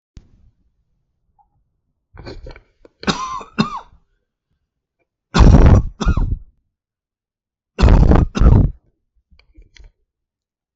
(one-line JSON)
{"three_cough_length": "10.8 s", "three_cough_amplitude": 32768, "three_cough_signal_mean_std_ratio": 0.33, "survey_phase": "beta (2021-08-13 to 2022-03-07)", "age": "45-64", "gender": "Male", "wearing_mask": "No", "symptom_cough_any": true, "symptom_runny_or_blocked_nose": true, "symptom_onset": "12 days", "smoker_status": "Never smoked", "respiratory_condition_asthma": false, "respiratory_condition_other": false, "recruitment_source": "REACT", "submission_delay": "0 days", "covid_test_result": "Negative", "covid_test_method": "RT-qPCR"}